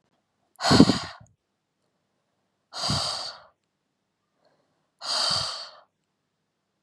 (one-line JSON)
{"exhalation_length": "6.8 s", "exhalation_amplitude": 31740, "exhalation_signal_mean_std_ratio": 0.3, "survey_phase": "beta (2021-08-13 to 2022-03-07)", "age": "18-44", "gender": "Female", "wearing_mask": "No", "symptom_none": true, "smoker_status": "Never smoked", "respiratory_condition_asthma": false, "respiratory_condition_other": false, "recruitment_source": "REACT", "submission_delay": "1 day", "covid_test_result": "Negative", "covid_test_method": "RT-qPCR"}